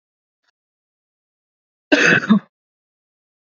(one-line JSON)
{"cough_length": "3.4 s", "cough_amplitude": 27992, "cough_signal_mean_std_ratio": 0.28, "survey_phase": "beta (2021-08-13 to 2022-03-07)", "age": "18-44", "gender": "Male", "wearing_mask": "No", "symptom_fatigue": true, "symptom_headache": true, "symptom_onset": "12 days", "smoker_status": "Never smoked", "respiratory_condition_asthma": true, "respiratory_condition_other": false, "recruitment_source": "REACT", "submission_delay": "2 days", "covid_test_result": "Negative", "covid_test_method": "RT-qPCR", "influenza_a_test_result": "Negative", "influenza_b_test_result": "Negative"}